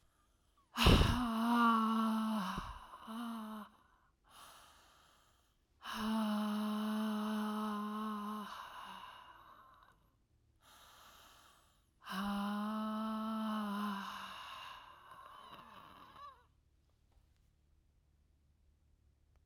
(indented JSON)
{
  "exhalation_length": "19.5 s",
  "exhalation_amplitude": 6805,
  "exhalation_signal_mean_std_ratio": 0.55,
  "survey_phase": "beta (2021-08-13 to 2022-03-07)",
  "age": "45-64",
  "gender": "Female",
  "wearing_mask": "No",
  "symptom_cough_any": true,
  "symptom_runny_or_blocked_nose": true,
  "symptom_onset": "13 days",
  "smoker_status": "Never smoked",
  "respiratory_condition_asthma": true,
  "respiratory_condition_other": false,
  "recruitment_source": "REACT",
  "submission_delay": "1 day",
  "covid_test_result": "Negative",
  "covid_test_method": "RT-qPCR",
  "influenza_a_test_result": "Unknown/Void",
  "influenza_b_test_result": "Unknown/Void"
}